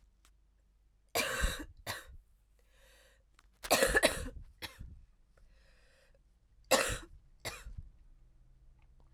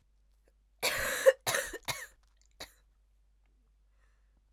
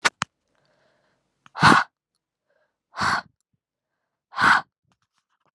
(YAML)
three_cough_length: 9.1 s
three_cough_amplitude: 8566
three_cough_signal_mean_std_ratio: 0.34
cough_length: 4.5 s
cough_amplitude: 11888
cough_signal_mean_std_ratio: 0.29
exhalation_length: 5.5 s
exhalation_amplitude: 28097
exhalation_signal_mean_std_ratio: 0.27
survey_phase: alpha (2021-03-01 to 2021-08-12)
age: 18-44
gender: Female
wearing_mask: 'No'
symptom_cough_any: true
symptom_new_continuous_cough: true
symptom_fatigue: true
symptom_headache: true
symptom_change_to_sense_of_smell_or_taste: true
symptom_onset: 3 days
smoker_status: Never smoked
respiratory_condition_asthma: false
respiratory_condition_other: false
recruitment_source: Test and Trace
submission_delay: 2 days
covid_test_result: Positive
covid_test_method: ePCR